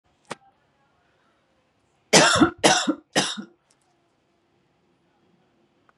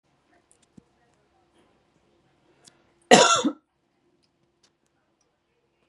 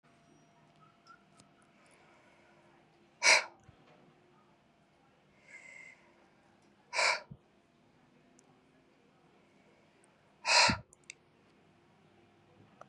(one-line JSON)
{"three_cough_length": "6.0 s", "three_cough_amplitude": 31665, "three_cough_signal_mean_std_ratio": 0.28, "cough_length": "5.9 s", "cough_amplitude": 32768, "cough_signal_mean_std_ratio": 0.19, "exhalation_length": "12.9 s", "exhalation_amplitude": 8823, "exhalation_signal_mean_std_ratio": 0.22, "survey_phase": "beta (2021-08-13 to 2022-03-07)", "age": "45-64", "gender": "Female", "wearing_mask": "No", "symptom_none": true, "smoker_status": "Never smoked", "respiratory_condition_asthma": false, "respiratory_condition_other": false, "recruitment_source": "REACT", "submission_delay": "2 days", "covid_test_result": "Negative", "covid_test_method": "RT-qPCR", "influenza_a_test_result": "Negative", "influenza_b_test_result": "Negative"}